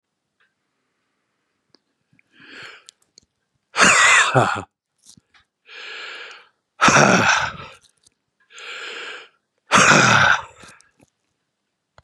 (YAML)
exhalation_length: 12.0 s
exhalation_amplitude: 32733
exhalation_signal_mean_std_ratio: 0.37
survey_phase: beta (2021-08-13 to 2022-03-07)
age: 65+
gender: Male
wearing_mask: 'No'
symptom_none: true
smoker_status: Ex-smoker
respiratory_condition_asthma: false
respiratory_condition_other: false
recruitment_source: REACT
submission_delay: 1 day
covid_test_result: Negative
covid_test_method: RT-qPCR
influenza_a_test_result: Negative
influenza_b_test_result: Negative